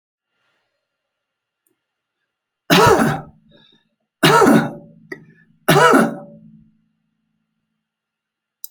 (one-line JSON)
{"three_cough_length": "8.7 s", "three_cough_amplitude": 31578, "three_cough_signal_mean_std_ratio": 0.33, "survey_phase": "alpha (2021-03-01 to 2021-08-12)", "age": "65+", "gender": "Male", "wearing_mask": "No", "symptom_none": true, "smoker_status": "Never smoked", "respiratory_condition_asthma": false, "respiratory_condition_other": false, "recruitment_source": "REACT", "submission_delay": "1 day", "covid_test_result": "Negative", "covid_test_method": "RT-qPCR"}